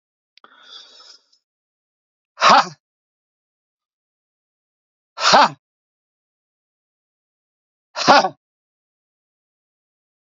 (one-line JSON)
{"exhalation_length": "10.2 s", "exhalation_amplitude": 30405, "exhalation_signal_mean_std_ratio": 0.22, "survey_phase": "beta (2021-08-13 to 2022-03-07)", "age": "45-64", "gender": "Male", "wearing_mask": "No", "symptom_cough_any": true, "symptom_new_continuous_cough": true, "symptom_headache": true, "symptom_loss_of_taste": true, "smoker_status": "Never smoked", "respiratory_condition_asthma": false, "respiratory_condition_other": false, "recruitment_source": "Test and Trace", "submission_delay": "2 days", "covid_test_result": "Positive", "covid_test_method": "RT-qPCR", "covid_ct_value": 32.4, "covid_ct_gene": "ORF1ab gene", "covid_ct_mean": 33.6, "covid_viral_load": "9.7 copies/ml", "covid_viral_load_category": "Minimal viral load (< 10K copies/ml)"}